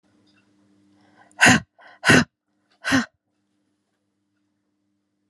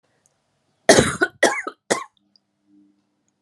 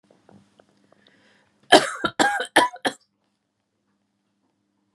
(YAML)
exhalation_length: 5.3 s
exhalation_amplitude: 31304
exhalation_signal_mean_std_ratio: 0.25
three_cough_length: 3.4 s
three_cough_amplitude: 32768
three_cough_signal_mean_std_ratio: 0.29
cough_length: 4.9 s
cough_amplitude: 32768
cough_signal_mean_std_ratio: 0.25
survey_phase: alpha (2021-03-01 to 2021-08-12)
age: 45-64
gender: Female
wearing_mask: 'No'
symptom_new_continuous_cough: true
symptom_shortness_of_breath: true
symptom_fatigue: true
symptom_fever_high_temperature: true
symptom_headache: true
symptom_change_to_sense_of_smell_or_taste: true
symptom_loss_of_taste: true
symptom_onset: 12 days
smoker_status: Never smoked
respiratory_condition_asthma: false
respiratory_condition_other: false
recruitment_source: REACT
submission_delay: 1 day
covid_test_result: Negative
covid_test_method: RT-qPCR